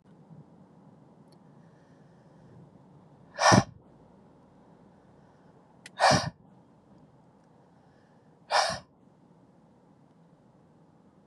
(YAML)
exhalation_length: 11.3 s
exhalation_amplitude: 18294
exhalation_signal_mean_std_ratio: 0.24
survey_phase: beta (2021-08-13 to 2022-03-07)
age: 18-44
gender: Male
wearing_mask: 'No'
symptom_none: true
symptom_onset: 7 days
smoker_status: Ex-smoker
respiratory_condition_asthma: false
respiratory_condition_other: false
recruitment_source: REACT
submission_delay: 2 days
covid_test_result: Negative
covid_test_method: RT-qPCR
influenza_a_test_result: Negative
influenza_b_test_result: Negative